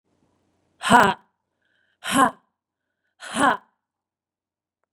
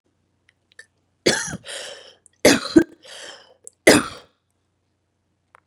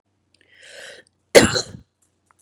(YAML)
exhalation_length: 4.9 s
exhalation_amplitude: 32500
exhalation_signal_mean_std_ratio: 0.27
three_cough_length: 5.7 s
three_cough_amplitude: 32767
three_cough_signal_mean_std_ratio: 0.26
cough_length: 2.4 s
cough_amplitude: 32768
cough_signal_mean_std_ratio: 0.22
survey_phase: beta (2021-08-13 to 2022-03-07)
age: 18-44
gender: Female
wearing_mask: 'No'
symptom_cough_any: true
symptom_new_continuous_cough: true
symptom_runny_or_blocked_nose: true
symptom_shortness_of_breath: true
symptom_sore_throat: true
symptom_fatigue: true
symptom_headache: true
symptom_change_to_sense_of_smell_or_taste: true
symptom_onset: 6 days
smoker_status: Ex-smoker
respiratory_condition_asthma: false
respiratory_condition_other: false
recruitment_source: Test and Trace
submission_delay: 2 days
covid_test_result: Positive
covid_test_method: RT-qPCR